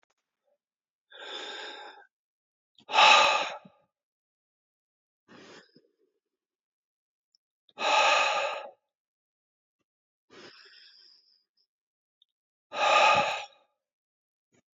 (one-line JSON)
{"exhalation_length": "14.8 s", "exhalation_amplitude": 19634, "exhalation_signal_mean_std_ratio": 0.3, "survey_phase": "beta (2021-08-13 to 2022-03-07)", "age": "45-64", "gender": "Male", "wearing_mask": "No", "symptom_cough_any": true, "symptom_runny_or_blocked_nose": true, "symptom_shortness_of_breath": true, "symptom_headache": true, "smoker_status": "Current smoker (11 or more cigarettes per day)", "respiratory_condition_asthma": false, "respiratory_condition_other": true, "recruitment_source": "REACT", "submission_delay": "1 day", "covid_test_result": "Negative", "covid_test_method": "RT-qPCR", "influenza_a_test_result": "Negative", "influenza_b_test_result": "Negative"}